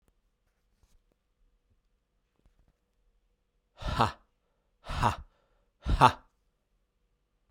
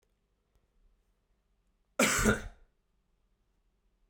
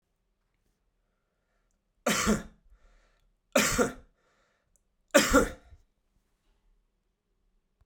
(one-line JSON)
{"exhalation_length": "7.5 s", "exhalation_amplitude": 18372, "exhalation_signal_mean_std_ratio": 0.22, "cough_length": "4.1 s", "cough_amplitude": 6989, "cough_signal_mean_std_ratio": 0.26, "three_cough_length": "7.9 s", "three_cough_amplitude": 15641, "three_cough_signal_mean_std_ratio": 0.28, "survey_phase": "beta (2021-08-13 to 2022-03-07)", "age": "45-64", "gender": "Male", "wearing_mask": "No", "symptom_cough_any": true, "symptom_runny_or_blocked_nose": true, "symptom_sore_throat": true, "symptom_fatigue": true, "symptom_headache": true, "smoker_status": "Never smoked", "respiratory_condition_asthma": false, "respiratory_condition_other": false, "recruitment_source": "Test and Trace", "submission_delay": "3 days", "covid_test_result": "Positive", "covid_test_method": "RT-qPCR"}